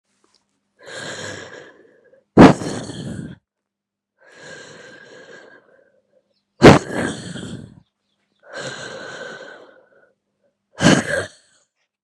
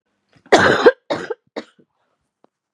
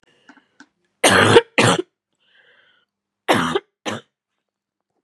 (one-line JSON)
{"exhalation_length": "12.0 s", "exhalation_amplitude": 32768, "exhalation_signal_mean_std_ratio": 0.25, "cough_length": "2.7 s", "cough_amplitude": 32768, "cough_signal_mean_std_ratio": 0.32, "three_cough_length": "5.0 s", "three_cough_amplitude": 32768, "three_cough_signal_mean_std_ratio": 0.33, "survey_phase": "beta (2021-08-13 to 2022-03-07)", "age": "18-44", "gender": "Female", "wearing_mask": "No", "symptom_cough_any": true, "symptom_new_continuous_cough": true, "symptom_runny_or_blocked_nose": true, "symptom_shortness_of_breath": true, "symptom_fatigue": true, "symptom_change_to_sense_of_smell_or_taste": true, "symptom_loss_of_taste": true, "symptom_onset": "5 days", "smoker_status": "Never smoked", "respiratory_condition_asthma": false, "respiratory_condition_other": false, "recruitment_source": "Test and Trace", "submission_delay": "1 day", "covid_test_result": "Positive", "covid_test_method": "RT-qPCR", "covid_ct_value": 14.5, "covid_ct_gene": "ORF1ab gene", "covid_ct_mean": 14.8, "covid_viral_load": "14000000 copies/ml", "covid_viral_load_category": "High viral load (>1M copies/ml)"}